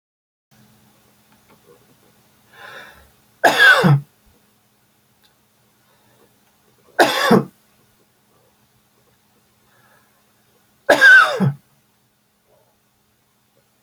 {
  "three_cough_length": "13.8 s",
  "three_cough_amplitude": 32767,
  "three_cough_signal_mean_std_ratio": 0.27,
  "survey_phase": "beta (2021-08-13 to 2022-03-07)",
  "age": "45-64",
  "gender": "Male",
  "wearing_mask": "No",
  "symptom_none": true,
  "smoker_status": "Ex-smoker",
  "respiratory_condition_asthma": true,
  "respiratory_condition_other": false,
  "recruitment_source": "REACT",
  "submission_delay": "4 days",
  "covid_test_result": "Negative",
  "covid_test_method": "RT-qPCR"
}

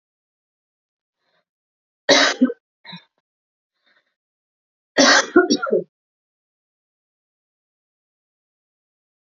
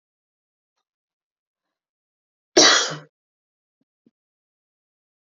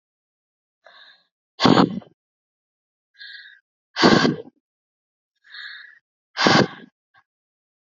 {
  "three_cough_length": "9.4 s",
  "three_cough_amplitude": 29896,
  "three_cough_signal_mean_std_ratio": 0.25,
  "cough_length": "5.3 s",
  "cough_amplitude": 30798,
  "cough_signal_mean_std_ratio": 0.19,
  "exhalation_length": "7.9 s",
  "exhalation_amplitude": 32768,
  "exhalation_signal_mean_std_ratio": 0.28,
  "survey_phase": "alpha (2021-03-01 to 2021-08-12)",
  "age": "18-44",
  "gender": "Female",
  "wearing_mask": "No",
  "symptom_change_to_sense_of_smell_or_taste": true,
  "symptom_onset": "2 days",
  "smoker_status": "Ex-smoker",
  "respiratory_condition_asthma": false,
  "respiratory_condition_other": false,
  "recruitment_source": "Test and Trace",
  "submission_delay": "2 days",
  "covid_test_result": "Positive",
  "covid_test_method": "RT-qPCR"
}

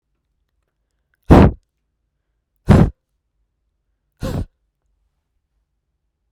{
  "exhalation_length": "6.3 s",
  "exhalation_amplitude": 32768,
  "exhalation_signal_mean_std_ratio": 0.22,
  "survey_phase": "beta (2021-08-13 to 2022-03-07)",
  "age": "18-44",
  "gender": "Female",
  "wearing_mask": "No",
  "symptom_runny_or_blocked_nose": true,
  "smoker_status": "Never smoked",
  "respiratory_condition_asthma": false,
  "respiratory_condition_other": false,
  "recruitment_source": "Test and Trace",
  "submission_delay": "1 day",
  "covid_test_result": "Positive",
  "covid_test_method": "RT-qPCR",
  "covid_ct_value": 18.0,
  "covid_ct_gene": "ORF1ab gene",
  "covid_ct_mean": 18.5,
  "covid_viral_load": "830000 copies/ml",
  "covid_viral_load_category": "Low viral load (10K-1M copies/ml)"
}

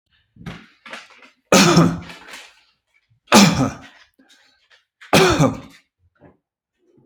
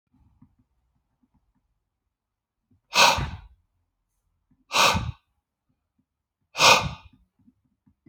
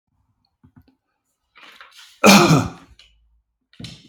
{
  "three_cough_length": "7.1 s",
  "three_cough_amplitude": 32767,
  "three_cough_signal_mean_std_ratio": 0.35,
  "exhalation_length": "8.1 s",
  "exhalation_amplitude": 26190,
  "exhalation_signal_mean_std_ratio": 0.26,
  "cough_length": "4.1 s",
  "cough_amplitude": 32767,
  "cough_signal_mean_std_ratio": 0.27,
  "survey_phase": "beta (2021-08-13 to 2022-03-07)",
  "age": "45-64",
  "gender": "Male",
  "wearing_mask": "No",
  "symptom_none": true,
  "smoker_status": "Ex-smoker",
  "respiratory_condition_asthma": false,
  "respiratory_condition_other": false,
  "recruitment_source": "REACT",
  "submission_delay": "4 days",
  "covid_test_result": "Negative",
  "covid_test_method": "RT-qPCR"
}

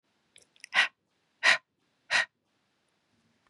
{
  "exhalation_length": "3.5 s",
  "exhalation_amplitude": 12549,
  "exhalation_signal_mean_std_ratio": 0.26,
  "survey_phase": "beta (2021-08-13 to 2022-03-07)",
  "age": "45-64",
  "gender": "Male",
  "wearing_mask": "No",
  "symptom_cough_any": true,
  "symptom_runny_or_blocked_nose": true,
  "symptom_fatigue": true,
  "symptom_headache": true,
  "symptom_onset": "4 days",
  "smoker_status": "Never smoked",
  "respiratory_condition_asthma": false,
  "respiratory_condition_other": false,
  "recruitment_source": "Test and Trace",
  "submission_delay": "2 days",
  "covid_test_result": "Positive",
  "covid_test_method": "ePCR"
}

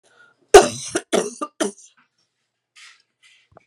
{
  "cough_length": "3.7 s",
  "cough_amplitude": 32768,
  "cough_signal_mean_std_ratio": 0.23,
  "survey_phase": "beta (2021-08-13 to 2022-03-07)",
  "age": "65+",
  "gender": "Female",
  "wearing_mask": "No",
  "symptom_cough_any": true,
  "symptom_runny_or_blocked_nose": true,
  "symptom_fatigue": true,
  "smoker_status": "Never smoked",
  "respiratory_condition_asthma": false,
  "respiratory_condition_other": true,
  "recruitment_source": "Test and Trace",
  "submission_delay": "2 days",
  "covid_test_result": "Positive",
  "covid_test_method": "RT-qPCR"
}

